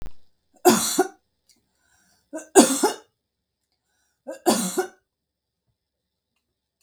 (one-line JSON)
{"three_cough_length": "6.8 s", "three_cough_amplitude": 32768, "three_cough_signal_mean_std_ratio": 0.3, "survey_phase": "beta (2021-08-13 to 2022-03-07)", "age": "65+", "gender": "Female", "wearing_mask": "No", "symptom_none": true, "symptom_onset": "6 days", "smoker_status": "Ex-smoker", "respiratory_condition_asthma": false, "respiratory_condition_other": false, "recruitment_source": "REACT", "submission_delay": "1 day", "covid_test_result": "Negative", "covid_test_method": "RT-qPCR", "influenza_a_test_result": "Negative", "influenza_b_test_result": "Negative"}